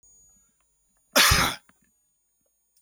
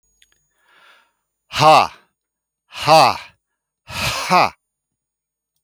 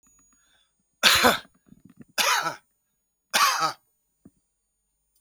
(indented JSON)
{
  "cough_length": "2.8 s",
  "cough_amplitude": 20170,
  "cough_signal_mean_std_ratio": 0.29,
  "exhalation_length": "5.6 s",
  "exhalation_amplitude": 32141,
  "exhalation_signal_mean_std_ratio": 0.33,
  "three_cough_length": "5.2 s",
  "three_cough_amplitude": 31929,
  "three_cough_signal_mean_std_ratio": 0.35,
  "survey_phase": "alpha (2021-03-01 to 2021-08-12)",
  "age": "45-64",
  "gender": "Male",
  "wearing_mask": "No",
  "symptom_none": true,
  "smoker_status": "Never smoked",
  "respiratory_condition_asthma": false,
  "respiratory_condition_other": false,
  "recruitment_source": "REACT",
  "submission_delay": "2 days",
  "covid_test_result": "Negative",
  "covid_test_method": "RT-qPCR"
}